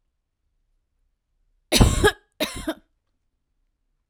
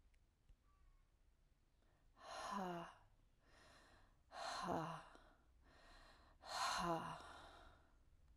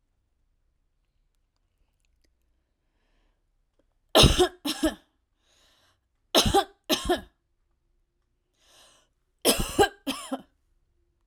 {"cough_length": "4.1 s", "cough_amplitude": 32767, "cough_signal_mean_std_ratio": 0.27, "exhalation_length": "8.4 s", "exhalation_amplitude": 992, "exhalation_signal_mean_std_ratio": 0.49, "three_cough_length": "11.3 s", "three_cough_amplitude": 29847, "three_cough_signal_mean_std_ratio": 0.27, "survey_phase": "alpha (2021-03-01 to 2021-08-12)", "age": "18-44", "gender": "Female", "wearing_mask": "No", "symptom_none": true, "symptom_onset": "12 days", "smoker_status": "Never smoked", "respiratory_condition_asthma": false, "respiratory_condition_other": false, "recruitment_source": "REACT", "submission_delay": "1 day", "covid_test_result": "Negative", "covid_test_method": "RT-qPCR"}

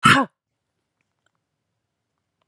{"exhalation_length": "2.5 s", "exhalation_amplitude": 29801, "exhalation_signal_mean_std_ratio": 0.22, "survey_phase": "alpha (2021-03-01 to 2021-08-12)", "age": "18-44", "gender": "Female", "wearing_mask": "No", "symptom_none": true, "smoker_status": "Ex-smoker", "respiratory_condition_asthma": false, "respiratory_condition_other": false, "recruitment_source": "REACT", "submission_delay": "5 days", "covid_test_result": "Negative", "covid_test_method": "RT-qPCR"}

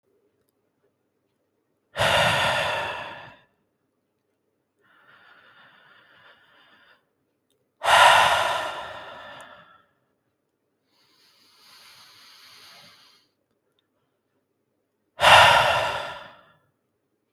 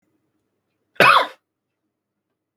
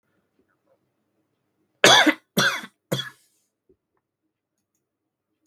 {"exhalation_length": "17.3 s", "exhalation_amplitude": 27838, "exhalation_signal_mean_std_ratio": 0.31, "cough_length": "2.6 s", "cough_amplitude": 32768, "cough_signal_mean_std_ratio": 0.25, "three_cough_length": "5.5 s", "three_cough_amplitude": 32766, "three_cough_signal_mean_std_ratio": 0.24, "survey_phase": "beta (2021-08-13 to 2022-03-07)", "age": "18-44", "gender": "Male", "wearing_mask": "No", "symptom_none": true, "smoker_status": "Current smoker (e-cigarettes or vapes only)", "respiratory_condition_asthma": false, "respiratory_condition_other": false, "recruitment_source": "Test and Trace", "submission_delay": "1 day", "covid_test_result": "Negative", "covid_test_method": "LFT"}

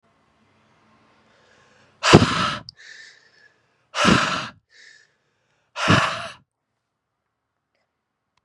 {"exhalation_length": "8.4 s", "exhalation_amplitude": 32768, "exhalation_signal_mean_std_ratio": 0.29, "survey_phase": "beta (2021-08-13 to 2022-03-07)", "age": "18-44", "gender": "Male", "wearing_mask": "No", "symptom_cough_any": true, "symptom_runny_or_blocked_nose": true, "symptom_fatigue": true, "symptom_fever_high_temperature": true, "symptom_change_to_sense_of_smell_or_taste": true, "symptom_loss_of_taste": true, "symptom_onset": "6 days", "smoker_status": "Never smoked", "respiratory_condition_asthma": false, "respiratory_condition_other": false, "recruitment_source": "Test and Trace", "submission_delay": "3 days", "covid_test_result": "Positive", "covid_test_method": "RT-qPCR", "covid_ct_value": 19.4, "covid_ct_gene": "ORF1ab gene", "covid_ct_mean": 20.6, "covid_viral_load": "170000 copies/ml", "covid_viral_load_category": "Low viral load (10K-1M copies/ml)"}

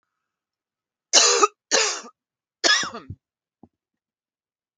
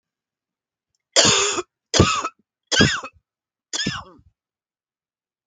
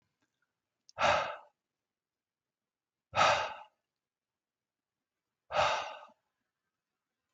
{"three_cough_length": "4.8 s", "three_cough_amplitude": 28753, "three_cough_signal_mean_std_ratio": 0.33, "cough_length": "5.5 s", "cough_amplitude": 32768, "cough_signal_mean_std_ratio": 0.36, "exhalation_length": "7.3 s", "exhalation_amplitude": 7549, "exhalation_signal_mean_std_ratio": 0.29, "survey_phase": "beta (2021-08-13 to 2022-03-07)", "age": "45-64", "gender": "Female", "wearing_mask": "No", "symptom_cough_any": true, "symptom_runny_or_blocked_nose": true, "symptom_sore_throat": true, "symptom_diarrhoea": true, "symptom_fatigue": true, "symptom_change_to_sense_of_smell_or_taste": true, "symptom_other": true, "smoker_status": "Never smoked", "respiratory_condition_asthma": false, "respiratory_condition_other": false, "recruitment_source": "Test and Trace", "submission_delay": "2 days", "covid_test_result": "Positive", "covid_test_method": "RT-qPCR", "covid_ct_value": 17.0, "covid_ct_gene": "N gene", "covid_ct_mean": 17.9, "covid_viral_load": "1300000 copies/ml", "covid_viral_load_category": "High viral load (>1M copies/ml)"}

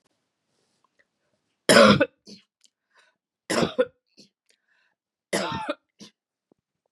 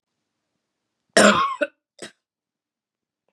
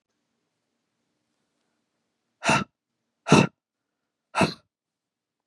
{"three_cough_length": "6.9 s", "three_cough_amplitude": 29473, "three_cough_signal_mean_std_ratio": 0.25, "cough_length": "3.3 s", "cough_amplitude": 29339, "cough_signal_mean_std_ratio": 0.27, "exhalation_length": "5.5 s", "exhalation_amplitude": 21705, "exhalation_signal_mean_std_ratio": 0.22, "survey_phase": "beta (2021-08-13 to 2022-03-07)", "age": "45-64", "gender": "Female", "wearing_mask": "No", "symptom_cough_any": true, "symptom_sore_throat": true, "symptom_onset": "2 days", "smoker_status": "Never smoked", "respiratory_condition_asthma": false, "respiratory_condition_other": false, "recruitment_source": "Test and Trace", "submission_delay": "1 day", "covid_test_result": "Positive", "covid_test_method": "ePCR"}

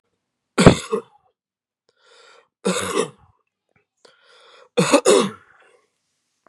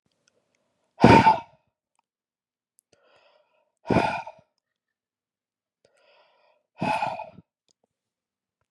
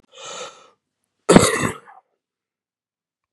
{"three_cough_length": "6.5 s", "three_cough_amplitude": 32768, "three_cough_signal_mean_std_ratio": 0.29, "exhalation_length": "8.7 s", "exhalation_amplitude": 28719, "exhalation_signal_mean_std_ratio": 0.23, "cough_length": "3.3 s", "cough_amplitude": 32768, "cough_signal_mean_std_ratio": 0.25, "survey_phase": "beta (2021-08-13 to 2022-03-07)", "age": "18-44", "gender": "Female", "wearing_mask": "No", "symptom_cough_any": true, "symptom_runny_or_blocked_nose": true, "symptom_shortness_of_breath": true, "symptom_sore_throat": true, "symptom_abdominal_pain": true, "symptom_fever_high_temperature": true, "symptom_headache": true, "smoker_status": "Never smoked", "respiratory_condition_asthma": true, "respiratory_condition_other": false, "recruitment_source": "Test and Trace", "submission_delay": "2 days", "covid_test_result": "Negative", "covid_test_method": "RT-qPCR"}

